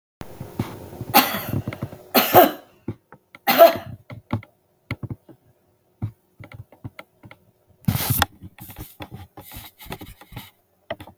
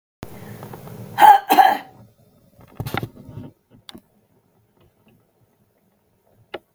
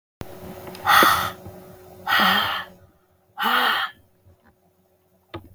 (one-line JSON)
{"three_cough_length": "11.2 s", "three_cough_amplitude": 32768, "three_cough_signal_mean_std_ratio": 0.31, "cough_length": "6.7 s", "cough_amplitude": 32766, "cough_signal_mean_std_ratio": 0.25, "exhalation_length": "5.5 s", "exhalation_amplitude": 32513, "exhalation_signal_mean_std_ratio": 0.46, "survey_phase": "beta (2021-08-13 to 2022-03-07)", "age": "65+", "gender": "Female", "wearing_mask": "No", "symptom_runny_or_blocked_nose": true, "symptom_onset": "2 days", "smoker_status": "Ex-smoker", "respiratory_condition_asthma": false, "respiratory_condition_other": false, "recruitment_source": "REACT", "submission_delay": "2 days", "covid_test_result": "Negative", "covid_test_method": "RT-qPCR", "influenza_a_test_result": "Negative", "influenza_b_test_result": "Negative"}